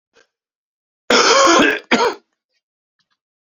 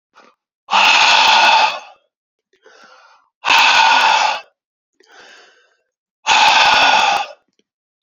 {
  "cough_length": "3.4 s",
  "cough_amplitude": 32767,
  "cough_signal_mean_std_ratio": 0.43,
  "exhalation_length": "8.0 s",
  "exhalation_amplitude": 32409,
  "exhalation_signal_mean_std_ratio": 0.55,
  "survey_phase": "alpha (2021-03-01 to 2021-08-12)",
  "age": "45-64",
  "gender": "Male",
  "wearing_mask": "No",
  "symptom_fatigue": true,
  "symptom_fever_high_temperature": true,
  "smoker_status": "Never smoked",
  "respiratory_condition_asthma": false,
  "respiratory_condition_other": false,
  "recruitment_source": "Test and Trace",
  "submission_delay": "2 days",
  "covid_test_result": "Positive",
  "covid_test_method": "RT-qPCR",
  "covid_ct_value": 18.4,
  "covid_ct_gene": "ORF1ab gene",
  "covid_ct_mean": 18.8,
  "covid_viral_load": "690000 copies/ml",
  "covid_viral_load_category": "Low viral load (10K-1M copies/ml)"
}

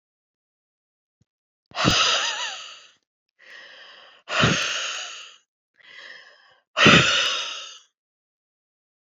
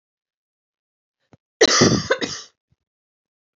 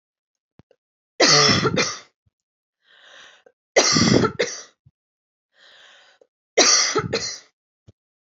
{
  "exhalation_length": "9.0 s",
  "exhalation_amplitude": 28529,
  "exhalation_signal_mean_std_ratio": 0.38,
  "cough_length": "3.6 s",
  "cough_amplitude": 31683,
  "cough_signal_mean_std_ratio": 0.3,
  "three_cough_length": "8.3 s",
  "three_cough_amplitude": 32590,
  "three_cough_signal_mean_std_ratio": 0.4,
  "survey_phase": "alpha (2021-03-01 to 2021-08-12)",
  "age": "18-44",
  "gender": "Female",
  "wearing_mask": "No",
  "symptom_none": true,
  "symptom_onset": "8 days",
  "smoker_status": "Never smoked",
  "respiratory_condition_asthma": false,
  "respiratory_condition_other": false,
  "recruitment_source": "REACT",
  "submission_delay": "1 day",
  "covid_test_result": "Negative",
  "covid_test_method": "RT-qPCR"
}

